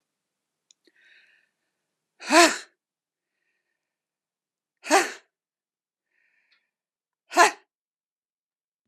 {"exhalation_length": "8.9 s", "exhalation_amplitude": 30539, "exhalation_signal_mean_std_ratio": 0.19, "survey_phase": "beta (2021-08-13 to 2022-03-07)", "age": "45-64", "gender": "Female", "wearing_mask": "No", "symptom_none": true, "smoker_status": "Never smoked", "respiratory_condition_asthma": false, "respiratory_condition_other": false, "recruitment_source": "REACT", "submission_delay": "2 days", "covid_test_result": "Negative", "covid_test_method": "RT-qPCR", "influenza_a_test_result": "Negative", "influenza_b_test_result": "Negative"}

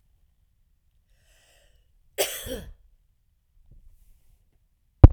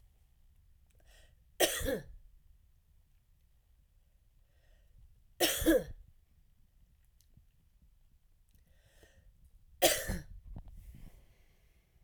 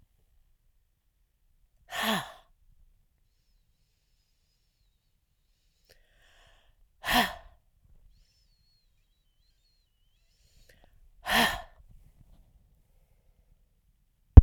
{"cough_length": "5.1 s", "cough_amplitude": 32768, "cough_signal_mean_std_ratio": 0.12, "three_cough_length": "12.0 s", "three_cough_amplitude": 8254, "three_cough_signal_mean_std_ratio": 0.29, "exhalation_length": "14.4 s", "exhalation_amplitude": 32768, "exhalation_signal_mean_std_ratio": 0.12, "survey_phase": "beta (2021-08-13 to 2022-03-07)", "age": "45-64", "gender": "Female", "wearing_mask": "No", "symptom_cough_any": true, "symptom_new_continuous_cough": true, "symptom_runny_or_blocked_nose": true, "symptom_sore_throat": true, "symptom_fatigue": true, "smoker_status": "Never smoked", "respiratory_condition_asthma": false, "respiratory_condition_other": false, "recruitment_source": "Test and Trace", "submission_delay": "2 days", "covid_test_result": "Positive", "covid_test_method": "RT-qPCR"}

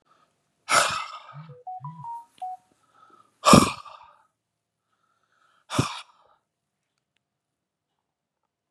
{"exhalation_length": "8.7 s", "exhalation_amplitude": 30578, "exhalation_signal_mean_std_ratio": 0.24, "survey_phase": "beta (2021-08-13 to 2022-03-07)", "age": "45-64", "gender": "Male", "wearing_mask": "No", "symptom_cough_any": true, "symptom_runny_or_blocked_nose": true, "symptom_sore_throat": true, "symptom_headache": true, "symptom_onset": "3 days", "smoker_status": "Ex-smoker", "respiratory_condition_asthma": false, "respiratory_condition_other": false, "recruitment_source": "Test and Trace", "submission_delay": "1 day", "covid_test_result": "Positive", "covid_test_method": "RT-qPCR", "covid_ct_value": 20.1, "covid_ct_gene": "N gene"}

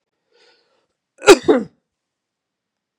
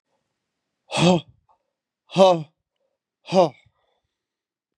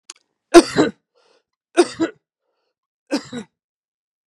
{"cough_length": "3.0 s", "cough_amplitude": 32768, "cough_signal_mean_std_ratio": 0.21, "exhalation_length": "4.8 s", "exhalation_amplitude": 28223, "exhalation_signal_mean_std_ratio": 0.28, "three_cough_length": "4.3 s", "three_cough_amplitude": 32768, "three_cough_signal_mean_std_ratio": 0.24, "survey_phase": "beta (2021-08-13 to 2022-03-07)", "age": "18-44", "gender": "Male", "wearing_mask": "No", "symptom_none": true, "smoker_status": "Never smoked", "respiratory_condition_asthma": true, "respiratory_condition_other": false, "recruitment_source": "REACT", "submission_delay": "1 day", "covid_test_result": "Negative", "covid_test_method": "RT-qPCR"}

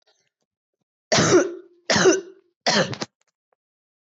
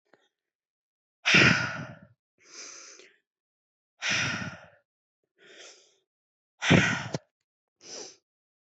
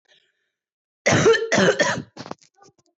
{"three_cough_length": "4.0 s", "three_cough_amplitude": 17342, "three_cough_signal_mean_std_ratio": 0.41, "exhalation_length": "8.7 s", "exhalation_amplitude": 15655, "exhalation_signal_mean_std_ratio": 0.31, "cough_length": "3.0 s", "cough_amplitude": 18817, "cough_signal_mean_std_ratio": 0.45, "survey_phase": "beta (2021-08-13 to 2022-03-07)", "age": "18-44", "gender": "Female", "wearing_mask": "No", "symptom_runny_or_blocked_nose": true, "symptom_shortness_of_breath": true, "symptom_onset": "3 days", "smoker_status": "Current smoker (1 to 10 cigarettes per day)", "respiratory_condition_asthma": true, "respiratory_condition_other": false, "recruitment_source": "Test and Trace", "submission_delay": "1 day", "covid_test_result": "Positive", "covid_test_method": "RT-qPCR", "covid_ct_value": 27.3, "covid_ct_gene": "ORF1ab gene"}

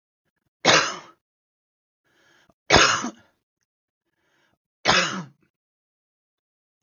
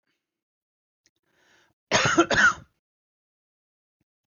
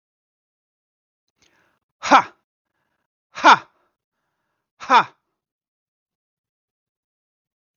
{"three_cough_length": "6.8 s", "three_cough_amplitude": 32766, "three_cough_signal_mean_std_ratio": 0.28, "cough_length": "4.3 s", "cough_amplitude": 19469, "cough_signal_mean_std_ratio": 0.28, "exhalation_length": "7.8 s", "exhalation_amplitude": 32768, "exhalation_signal_mean_std_ratio": 0.18, "survey_phase": "beta (2021-08-13 to 2022-03-07)", "age": "45-64", "gender": "Male", "wearing_mask": "No", "symptom_cough_any": true, "smoker_status": "Never smoked", "respiratory_condition_asthma": false, "respiratory_condition_other": false, "recruitment_source": "REACT", "submission_delay": "2 days", "covid_test_result": "Negative", "covid_test_method": "RT-qPCR"}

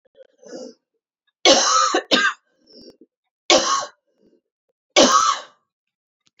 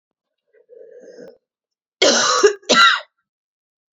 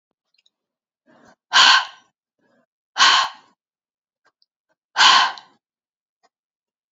{"three_cough_length": "6.4 s", "three_cough_amplitude": 30765, "three_cough_signal_mean_std_ratio": 0.4, "cough_length": "3.9 s", "cough_amplitude": 30951, "cough_signal_mean_std_ratio": 0.38, "exhalation_length": "6.9 s", "exhalation_amplitude": 30918, "exhalation_signal_mean_std_ratio": 0.29, "survey_phase": "beta (2021-08-13 to 2022-03-07)", "age": "45-64", "gender": "Female", "wearing_mask": "No", "symptom_new_continuous_cough": true, "symptom_runny_or_blocked_nose": true, "symptom_other": true, "symptom_onset": "3 days", "smoker_status": "Never smoked", "respiratory_condition_asthma": false, "respiratory_condition_other": false, "recruitment_source": "Test and Trace", "submission_delay": "2 days", "covid_test_result": "Positive", "covid_test_method": "RT-qPCR", "covid_ct_value": 16.9, "covid_ct_gene": "ORF1ab gene", "covid_ct_mean": 17.3, "covid_viral_load": "2100000 copies/ml", "covid_viral_load_category": "High viral load (>1M copies/ml)"}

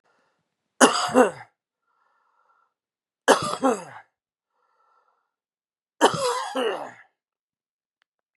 {"three_cough_length": "8.4 s", "three_cough_amplitude": 31558, "three_cough_signal_mean_std_ratio": 0.3, "survey_phase": "beta (2021-08-13 to 2022-03-07)", "age": "18-44", "gender": "Male", "wearing_mask": "No", "symptom_cough_any": true, "symptom_runny_or_blocked_nose": true, "symptom_sore_throat": true, "symptom_headache": true, "symptom_other": true, "symptom_onset": "2 days", "smoker_status": "Ex-smoker", "respiratory_condition_asthma": false, "respiratory_condition_other": false, "recruitment_source": "Test and Trace", "submission_delay": "1 day", "covid_test_result": "Positive", "covid_test_method": "RT-qPCR", "covid_ct_value": 17.8, "covid_ct_gene": "N gene"}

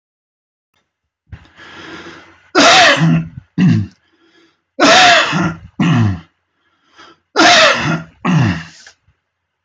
{"three_cough_length": "9.6 s", "three_cough_amplitude": 32768, "three_cough_signal_mean_std_ratio": 0.51, "survey_phase": "beta (2021-08-13 to 2022-03-07)", "age": "65+", "gender": "Male", "wearing_mask": "No", "symptom_none": true, "smoker_status": "Ex-smoker", "respiratory_condition_asthma": false, "respiratory_condition_other": false, "recruitment_source": "REACT", "submission_delay": "1 day", "covid_test_result": "Negative", "covid_test_method": "RT-qPCR"}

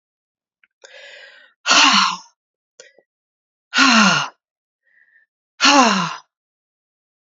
{"exhalation_length": "7.3 s", "exhalation_amplitude": 32767, "exhalation_signal_mean_std_ratio": 0.37, "survey_phase": "beta (2021-08-13 to 2022-03-07)", "age": "45-64", "gender": "Female", "wearing_mask": "No", "symptom_new_continuous_cough": true, "symptom_runny_or_blocked_nose": true, "symptom_sore_throat": true, "symptom_other": true, "smoker_status": "Never smoked", "respiratory_condition_asthma": false, "respiratory_condition_other": false, "recruitment_source": "Test and Trace", "submission_delay": "3 days", "covid_test_result": "Positive", "covid_test_method": "ePCR"}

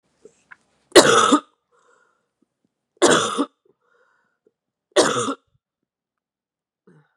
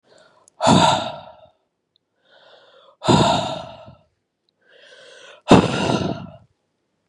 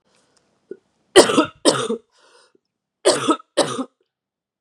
{"three_cough_length": "7.2 s", "three_cough_amplitude": 32768, "three_cough_signal_mean_std_ratio": 0.29, "exhalation_length": "7.1 s", "exhalation_amplitude": 32768, "exhalation_signal_mean_std_ratio": 0.37, "cough_length": "4.6 s", "cough_amplitude": 32768, "cough_signal_mean_std_ratio": 0.33, "survey_phase": "beta (2021-08-13 to 2022-03-07)", "age": "18-44", "gender": "Female", "wearing_mask": "No", "symptom_cough_any": true, "symptom_new_continuous_cough": true, "symptom_runny_or_blocked_nose": true, "symptom_sore_throat": true, "symptom_onset": "12 days", "smoker_status": "Ex-smoker", "respiratory_condition_asthma": false, "respiratory_condition_other": false, "recruitment_source": "REACT", "submission_delay": "1 day", "covid_test_result": "Negative", "covid_test_method": "RT-qPCR"}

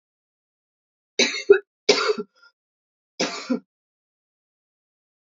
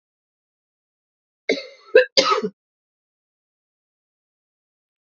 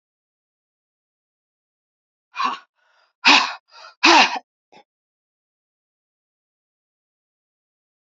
{"three_cough_length": "5.3 s", "three_cough_amplitude": 29812, "three_cough_signal_mean_std_ratio": 0.26, "cough_length": "5.0 s", "cough_amplitude": 28542, "cough_signal_mean_std_ratio": 0.22, "exhalation_length": "8.1 s", "exhalation_amplitude": 32768, "exhalation_signal_mean_std_ratio": 0.22, "survey_phase": "beta (2021-08-13 to 2022-03-07)", "age": "65+", "gender": "Female", "wearing_mask": "No", "symptom_cough_any": true, "symptom_runny_or_blocked_nose": true, "symptom_fatigue": true, "symptom_headache": true, "symptom_change_to_sense_of_smell_or_taste": true, "symptom_onset": "3 days", "smoker_status": "Never smoked", "respiratory_condition_asthma": false, "respiratory_condition_other": false, "recruitment_source": "Test and Trace", "submission_delay": "1 day", "covid_test_result": "Positive", "covid_test_method": "ePCR"}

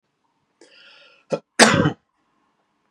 {"cough_length": "2.9 s", "cough_amplitude": 32768, "cough_signal_mean_std_ratio": 0.26, "survey_phase": "beta (2021-08-13 to 2022-03-07)", "age": "18-44", "gender": "Male", "wearing_mask": "No", "symptom_runny_or_blocked_nose": true, "symptom_onset": "7 days", "smoker_status": "Ex-smoker", "respiratory_condition_asthma": false, "respiratory_condition_other": false, "recruitment_source": "Test and Trace", "submission_delay": "2 days", "covid_test_result": "Positive", "covid_test_method": "RT-qPCR", "covid_ct_value": 27.8, "covid_ct_gene": "N gene"}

